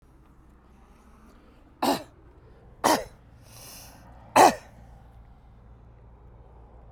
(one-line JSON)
{"three_cough_length": "6.9 s", "three_cough_amplitude": 26263, "three_cough_signal_mean_std_ratio": 0.26, "survey_phase": "beta (2021-08-13 to 2022-03-07)", "age": "65+", "gender": "Male", "wearing_mask": "No", "symptom_none": true, "smoker_status": "Never smoked", "respiratory_condition_asthma": false, "respiratory_condition_other": false, "recruitment_source": "REACT", "submission_delay": "1 day", "covid_test_result": "Negative", "covid_test_method": "RT-qPCR"}